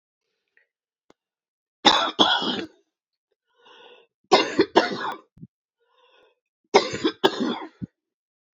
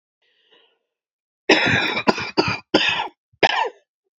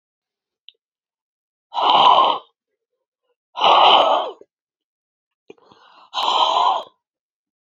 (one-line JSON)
{"three_cough_length": "8.5 s", "three_cough_amplitude": 28711, "three_cough_signal_mean_std_ratio": 0.33, "cough_length": "4.2 s", "cough_amplitude": 32767, "cough_signal_mean_std_ratio": 0.45, "exhalation_length": "7.7 s", "exhalation_amplitude": 28542, "exhalation_signal_mean_std_ratio": 0.41, "survey_phase": "beta (2021-08-13 to 2022-03-07)", "age": "45-64", "gender": "Female", "wearing_mask": "No", "symptom_cough_any": true, "symptom_shortness_of_breath": true, "smoker_status": "Current smoker (11 or more cigarettes per day)", "respiratory_condition_asthma": true, "respiratory_condition_other": false, "recruitment_source": "REACT", "submission_delay": "1 day", "covid_test_result": "Negative", "covid_test_method": "RT-qPCR", "influenza_a_test_result": "Unknown/Void", "influenza_b_test_result": "Unknown/Void"}